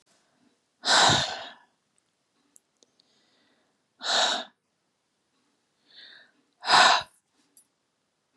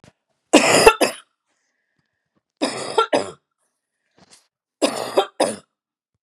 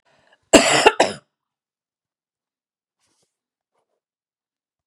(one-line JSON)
{"exhalation_length": "8.4 s", "exhalation_amplitude": 19220, "exhalation_signal_mean_std_ratio": 0.3, "three_cough_length": "6.2 s", "three_cough_amplitude": 32768, "three_cough_signal_mean_std_ratio": 0.33, "cough_length": "4.9 s", "cough_amplitude": 32768, "cough_signal_mean_std_ratio": 0.22, "survey_phase": "beta (2021-08-13 to 2022-03-07)", "age": "65+", "gender": "Female", "wearing_mask": "No", "symptom_none": true, "smoker_status": "Ex-smoker", "respiratory_condition_asthma": false, "respiratory_condition_other": false, "recruitment_source": "REACT", "submission_delay": "2 days", "covid_test_result": "Negative", "covid_test_method": "RT-qPCR", "influenza_a_test_result": "Negative", "influenza_b_test_result": "Negative"}